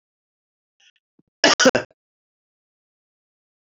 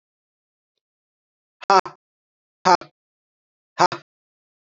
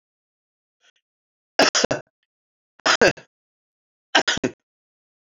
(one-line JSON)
{"cough_length": "3.8 s", "cough_amplitude": 31207, "cough_signal_mean_std_ratio": 0.2, "exhalation_length": "4.7 s", "exhalation_amplitude": 31601, "exhalation_signal_mean_std_ratio": 0.19, "three_cough_length": "5.2 s", "three_cough_amplitude": 28215, "three_cough_signal_mean_std_ratio": 0.27, "survey_phase": "beta (2021-08-13 to 2022-03-07)", "age": "45-64", "gender": "Male", "wearing_mask": "No", "symptom_cough_any": true, "symptom_runny_or_blocked_nose": true, "symptom_sore_throat": true, "symptom_onset": "3 days", "smoker_status": "Never smoked", "respiratory_condition_asthma": false, "respiratory_condition_other": false, "recruitment_source": "Test and Trace", "submission_delay": "1 day", "covid_test_result": "Positive", "covid_test_method": "RT-qPCR", "covid_ct_value": 27.9, "covid_ct_gene": "ORF1ab gene", "covid_ct_mean": 28.3, "covid_viral_load": "510 copies/ml", "covid_viral_load_category": "Minimal viral load (< 10K copies/ml)"}